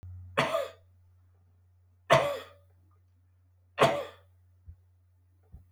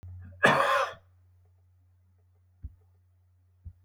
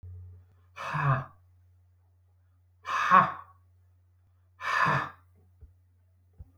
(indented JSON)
{
  "three_cough_length": "5.7 s",
  "three_cough_amplitude": 14465,
  "three_cough_signal_mean_std_ratio": 0.31,
  "cough_length": "3.8 s",
  "cough_amplitude": 17135,
  "cough_signal_mean_std_ratio": 0.32,
  "exhalation_length": "6.6 s",
  "exhalation_amplitude": 16545,
  "exhalation_signal_mean_std_ratio": 0.35,
  "survey_phase": "alpha (2021-03-01 to 2021-08-12)",
  "age": "65+",
  "gender": "Male",
  "wearing_mask": "No",
  "symptom_none": true,
  "smoker_status": "Never smoked",
  "respiratory_condition_asthma": false,
  "respiratory_condition_other": false,
  "recruitment_source": "REACT",
  "submission_delay": "1 day",
  "covid_test_result": "Negative",
  "covid_test_method": "RT-qPCR"
}